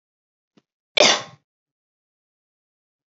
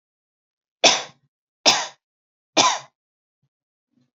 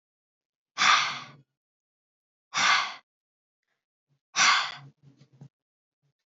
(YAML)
cough_length: 3.1 s
cough_amplitude: 29588
cough_signal_mean_std_ratio: 0.2
three_cough_length: 4.2 s
three_cough_amplitude: 32537
three_cough_signal_mean_std_ratio: 0.27
exhalation_length: 6.4 s
exhalation_amplitude: 14431
exhalation_signal_mean_std_ratio: 0.32
survey_phase: beta (2021-08-13 to 2022-03-07)
age: 18-44
gender: Female
wearing_mask: 'No'
symptom_none: true
symptom_onset: 4 days
smoker_status: Never smoked
respiratory_condition_asthma: false
respiratory_condition_other: false
recruitment_source: REACT
submission_delay: 2 days
covid_test_result: Negative
covid_test_method: RT-qPCR
influenza_a_test_result: Negative
influenza_b_test_result: Negative